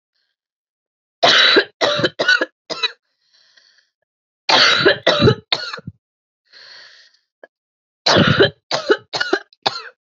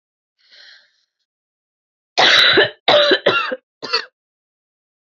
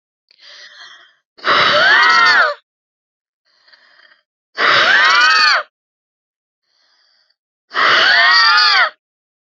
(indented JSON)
{
  "three_cough_length": "10.2 s",
  "three_cough_amplitude": 31660,
  "three_cough_signal_mean_std_ratio": 0.42,
  "cough_length": "5.0 s",
  "cough_amplitude": 31375,
  "cough_signal_mean_std_ratio": 0.4,
  "exhalation_length": "9.6 s",
  "exhalation_amplitude": 32768,
  "exhalation_signal_mean_std_ratio": 0.53,
  "survey_phase": "beta (2021-08-13 to 2022-03-07)",
  "age": "18-44",
  "gender": "Female",
  "wearing_mask": "No",
  "symptom_cough_any": true,
  "symptom_shortness_of_breath": true,
  "symptom_sore_throat": true,
  "symptom_fever_high_temperature": true,
  "symptom_headache": true,
  "symptom_loss_of_taste": true,
  "symptom_onset": "2 days",
  "smoker_status": "Ex-smoker",
  "respiratory_condition_asthma": true,
  "respiratory_condition_other": false,
  "recruitment_source": "Test and Trace",
  "submission_delay": "1 day",
  "covid_test_result": "Positive",
  "covid_test_method": "LAMP"
}